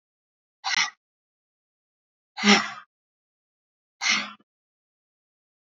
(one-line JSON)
{"exhalation_length": "5.6 s", "exhalation_amplitude": 23198, "exhalation_signal_mean_std_ratio": 0.26, "survey_phase": "beta (2021-08-13 to 2022-03-07)", "age": "65+", "gender": "Female", "wearing_mask": "No", "symptom_none": true, "symptom_onset": "9 days", "smoker_status": "Never smoked", "respiratory_condition_asthma": false, "respiratory_condition_other": false, "recruitment_source": "REACT", "submission_delay": "3 days", "covid_test_result": "Negative", "covid_test_method": "RT-qPCR", "influenza_a_test_result": "Negative", "influenza_b_test_result": "Negative"}